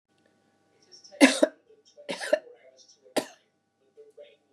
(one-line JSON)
{"three_cough_length": "4.5 s", "three_cough_amplitude": 24447, "three_cough_signal_mean_std_ratio": 0.23, "survey_phase": "beta (2021-08-13 to 2022-03-07)", "age": "45-64", "gender": "Female", "wearing_mask": "No", "symptom_none": true, "smoker_status": "Never smoked", "respiratory_condition_asthma": false, "respiratory_condition_other": false, "recruitment_source": "REACT", "submission_delay": "0 days", "covid_test_result": "Negative", "covid_test_method": "RT-qPCR", "influenza_a_test_result": "Negative", "influenza_b_test_result": "Negative"}